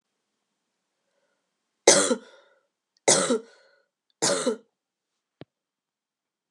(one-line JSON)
{"three_cough_length": "6.5 s", "three_cough_amplitude": 27990, "three_cough_signal_mean_std_ratio": 0.27, "survey_phase": "beta (2021-08-13 to 2022-03-07)", "age": "18-44", "gender": "Female", "wearing_mask": "No", "symptom_cough_any": true, "symptom_runny_or_blocked_nose": true, "symptom_sore_throat": true, "symptom_fatigue": true, "symptom_fever_high_temperature": true, "symptom_headache": true, "symptom_change_to_sense_of_smell_or_taste": true, "symptom_onset": "2 days", "smoker_status": "Never smoked", "respiratory_condition_asthma": false, "respiratory_condition_other": false, "recruitment_source": "Test and Trace", "submission_delay": "2 days", "covid_test_result": "Positive", "covid_test_method": "RT-qPCR", "covid_ct_value": 14.8, "covid_ct_gene": "ORF1ab gene", "covid_ct_mean": 15.0, "covid_viral_load": "12000000 copies/ml", "covid_viral_load_category": "High viral load (>1M copies/ml)"}